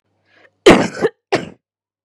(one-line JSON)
{"cough_length": "2.0 s", "cough_amplitude": 32768, "cough_signal_mean_std_ratio": 0.32, "survey_phase": "beta (2021-08-13 to 2022-03-07)", "age": "18-44", "gender": "Female", "wearing_mask": "No", "symptom_cough_any": true, "symptom_runny_or_blocked_nose": true, "symptom_onset": "7 days", "smoker_status": "Current smoker (1 to 10 cigarettes per day)", "respiratory_condition_asthma": false, "respiratory_condition_other": false, "recruitment_source": "REACT", "submission_delay": "2 days", "covid_test_result": "Negative", "covid_test_method": "RT-qPCR", "covid_ct_value": 47.0, "covid_ct_gene": "N gene"}